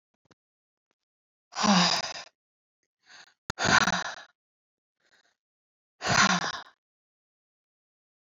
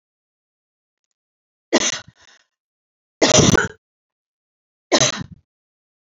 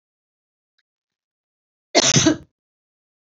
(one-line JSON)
{"exhalation_length": "8.3 s", "exhalation_amplitude": 14152, "exhalation_signal_mean_std_ratio": 0.32, "three_cough_length": "6.1 s", "three_cough_amplitude": 30703, "three_cough_signal_mean_std_ratio": 0.28, "cough_length": "3.2 s", "cough_amplitude": 30062, "cough_signal_mean_std_ratio": 0.27, "survey_phase": "beta (2021-08-13 to 2022-03-07)", "age": "45-64", "gender": "Female", "wearing_mask": "No", "symptom_none": true, "smoker_status": "Never smoked", "respiratory_condition_asthma": false, "respiratory_condition_other": false, "recruitment_source": "REACT", "submission_delay": "1 day", "covid_test_result": "Negative", "covid_test_method": "RT-qPCR", "influenza_a_test_result": "Negative", "influenza_b_test_result": "Negative"}